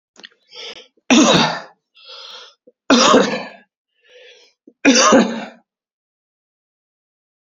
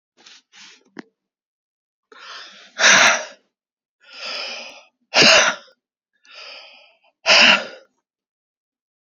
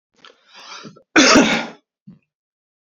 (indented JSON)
{
  "three_cough_length": "7.4 s",
  "three_cough_amplitude": 32768,
  "three_cough_signal_mean_std_ratio": 0.38,
  "exhalation_length": "9.0 s",
  "exhalation_amplitude": 32768,
  "exhalation_signal_mean_std_ratio": 0.32,
  "cough_length": "2.8 s",
  "cough_amplitude": 30538,
  "cough_signal_mean_std_ratio": 0.35,
  "survey_phase": "alpha (2021-03-01 to 2021-08-12)",
  "age": "18-44",
  "gender": "Male",
  "wearing_mask": "No",
  "symptom_none": true,
  "smoker_status": "Never smoked",
  "respiratory_condition_asthma": false,
  "respiratory_condition_other": false,
  "recruitment_source": "REACT",
  "submission_delay": "1 day",
  "covid_test_result": "Negative",
  "covid_test_method": "RT-qPCR"
}